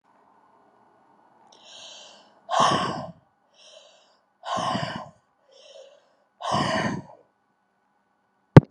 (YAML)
exhalation_length: 8.7 s
exhalation_amplitude: 32768
exhalation_signal_mean_std_ratio: 0.24
survey_phase: alpha (2021-03-01 to 2021-08-12)
age: 65+
gender: Female
wearing_mask: 'No'
symptom_fatigue: true
symptom_headache: true
smoker_status: Never smoked
respiratory_condition_asthma: false
respiratory_condition_other: false
recruitment_source: REACT
submission_delay: 1 day
covid_test_result: Negative
covid_test_method: RT-qPCR